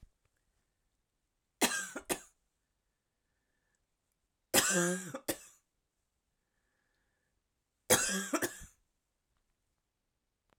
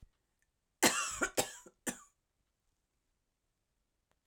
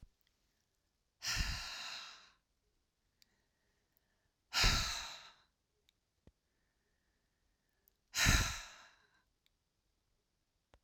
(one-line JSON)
{"three_cough_length": "10.6 s", "three_cough_amplitude": 8842, "three_cough_signal_mean_std_ratio": 0.28, "cough_length": "4.3 s", "cough_amplitude": 7034, "cough_signal_mean_std_ratio": 0.26, "exhalation_length": "10.8 s", "exhalation_amplitude": 5970, "exhalation_signal_mean_std_ratio": 0.29, "survey_phase": "alpha (2021-03-01 to 2021-08-12)", "age": "45-64", "gender": "Female", "wearing_mask": "No", "symptom_none": true, "smoker_status": "Never smoked", "respiratory_condition_asthma": true, "respiratory_condition_other": false, "recruitment_source": "REACT", "submission_delay": "1 day", "covid_test_result": "Negative", "covid_test_method": "RT-qPCR"}